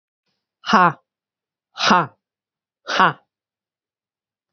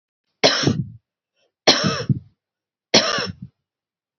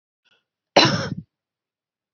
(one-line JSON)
{"exhalation_length": "4.5 s", "exhalation_amplitude": 28679, "exhalation_signal_mean_std_ratio": 0.28, "three_cough_length": "4.2 s", "three_cough_amplitude": 32291, "three_cough_signal_mean_std_ratio": 0.39, "cough_length": "2.1 s", "cough_amplitude": 29635, "cough_signal_mean_std_ratio": 0.28, "survey_phase": "alpha (2021-03-01 to 2021-08-12)", "age": "45-64", "gender": "Female", "wearing_mask": "No", "symptom_none": true, "smoker_status": "Never smoked", "respiratory_condition_asthma": false, "respiratory_condition_other": false, "recruitment_source": "REACT", "submission_delay": "3 days", "covid_test_result": "Negative", "covid_test_method": "RT-qPCR"}